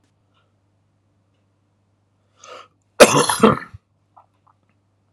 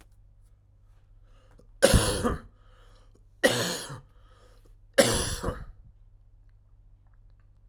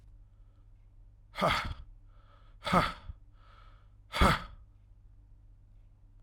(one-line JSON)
{"cough_length": "5.1 s", "cough_amplitude": 32768, "cough_signal_mean_std_ratio": 0.22, "three_cough_length": "7.7 s", "three_cough_amplitude": 23722, "three_cough_signal_mean_std_ratio": 0.35, "exhalation_length": "6.2 s", "exhalation_amplitude": 10766, "exhalation_signal_mean_std_ratio": 0.35, "survey_phase": "alpha (2021-03-01 to 2021-08-12)", "age": "45-64", "gender": "Male", "wearing_mask": "No", "symptom_none": true, "smoker_status": "Never smoked", "respiratory_condition_asthma": true, "respiratory_condition_other": false, "recruitment_source": "REACT", "submission_delay": "6 days", "covid_test_result": "Negative", "covid_test_method": "RT-qPCR"}